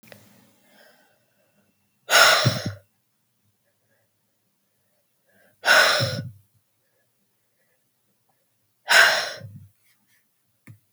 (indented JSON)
{
  "exhalation_length": "10.9 s",
  "exhalation_amplitude": 29866,
  "exhalation_signal_mean_std_ratio": 0.29,
  "survey_phase": "beta (2021-08-13 to 2022-03-07)",
  "age": "45-64",
  "gender": "Female",
  "wearing_mask": "No",
  "symptom_cough_any": true,
  "symptom_runny_or_blocked_nose": true,
  "symptom_sore_throat": true,
  "symptom_onset": "2 days",
  "smoker_status": "Ex-smoker",
  "respiratory_condition_asthma": false,
  "respiratory_condition_other": false,
  "recruitment_source": "Test and Trace",
  "submission_delay": "1 day",
  "covid_test_result": "Negative",
  "covid_test_method": "ePCR"
}